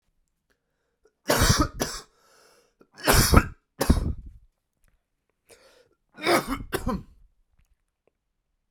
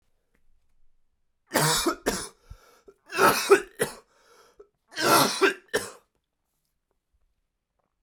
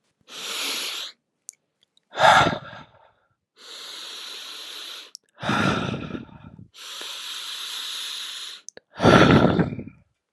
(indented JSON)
{
  "cough_length": "8.7 s",
  "cough_amplitude": 29789,
  "cough_signal_mean_std_ratio": 0.33,
  "three_cough_length": "8.0 s",
  "three_cough_amplitude": 18780,
  "three_cough_signal_mean_std_ratio": 0.35,
  "exhalation_length": "10.3 s",
  "exhalation_amplitude": 30367,
  "exhalation_signal_mean_std_ratio": 0.42,
  "survey_phase": "alpha (2021-03-01 to 2021-08-12)",
  "age": "18-44",
  "gender": "Male",
  "wearing_mask": "No",
  "symptom_cough_any": true,
  "symptom_diarrhoea": true,
  "symptom_fatigue": true,
  "symptom_fever_high_temperature": true,
  "symptom_headache": true,
  "symptom_onset": "6 days",
  "smoker_status": "Never smoked",
  "respiratory_condition_asthma": false,
  "respiratory_condition_other": false,
  "recruitment_source": "Test and Trace",
  "submission_delay": "3 days",
  "covid_test_result": "Positive",
  "covid_test_method": "RT-qPCR"
}